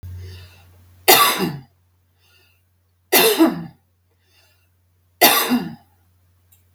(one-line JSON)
{"three_cough_length": "6.7 s", "three_cough_amplitude": 32768, "three_cough_signal_mean_std_ratio": 0.36, "survey_phase": "beta (2021-08-13 to 2022-03-07)", "age": "45-64", "gender": "Female", "wearing_mask": "No", "symptom_none": true, "smoker_status": "Never smoked", "respiratory_condition_asthma": true, "respiratory_condition_other": false, "recruitment_source": "REACT", "submission_delay": "2 days", "covid_test_result": "Negative", "covid_test_method": "RT-qPCR", "influenza_a_test_result": "Negative", "influenza_b_test_result": "Negative"}